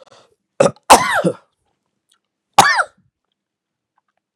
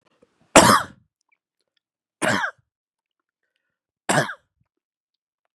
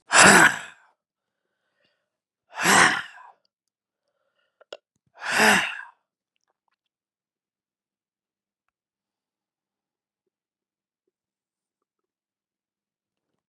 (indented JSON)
{
  "cough_length": "4.4 s",
  "cough_amplitude": 32768,
  "cough_signal_mean_std_ratio": 0.29,
  "three_cough_length": "5.5 s",
  "three_cough_amplitude": 32768,
  "three_cough_signal_mean_std_ratio": 0.25,
  "exhalation_length": "13.5 s",
  "exhalation_amplitude": 32690,
  "exhalation_signal_mean_std_ratio": 0.23,
  "survey_phase": "beta (2021-08-13 to 2022-03-07)",
  "age": "45-64",
  "gender": "Male",
  "wearing_mask": "No",
  "symptom_cough_any": true,
  "symptom_runny_or_blocked_nose": true,
  "symptom_sore_throat": true,
  "symptom_fatigue": true,
  "symptom_fever_high_temperature": true,
  "symptom_headache": true,
  "symptom_onset": "3 days",
  "smoker_status": "Ex-smoker",
  "respiratory_condition_asthma": false,
  "respiratory_condition_other": false,
  "recruitment_source": "Test and Trace",
  "submission_delay": "2 days",
  "covid_test_result": "Positive",
  "covid_test_method": "RT-qPCR",
  "covid_ct_value": 20.4,
  "covid_ct_gene": "ORF1ab gene"
}